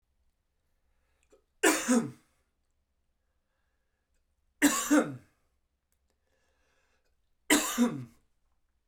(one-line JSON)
{"three_cough_length": "8.9 s", "three_cough_amplitude": 10458, "three_cough_signal_mean_std_ratio": 0.29, "survey_phase": "beta (2021-08-13 to 2022-03-07)", "age": "18-44", "gender": "Male", "wearing_mask": "No", "symptom_none": true, "smoker_status": "Never smoked", "respiratory_condition_asthma": false, "respiratory_condition_other": false, "recruitment_source": "REACT", "submission_delay": "3 days", "covid_test_result": "Negative", "covid_test_method": "RT-qPCR", "influenza_a_test_result": "Negative", "influenza_b_test_result": "Negative"}